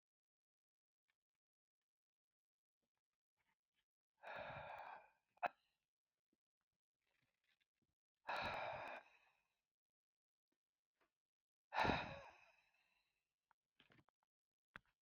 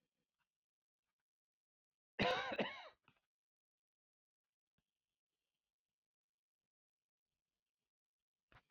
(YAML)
exhalation_length: 15.0 s
exhalation_amplitude: 1716
exhalation_signal_mean_std_ratio: 0.25
cough_length: 8.7 s
cough_amplitude: 2016
cough_signal_mean_std_ratio: 0.19
survey_phase: beta (2021-08-13 to 2022-03-07)
age: 65+
gender: Male
wearing_mask: 'No'
symptom_cough_any: true
smoker_status: Never smoked
respiratory_condition_asthma: false
respiratory_condition_other: false
recruitment_source: REACT
submission_delay: 3 days
covid_test_result: Negative
covid_test_method: RT-qPCR
influenza_a_test_result: Negative
influenza_b_test_result: Negative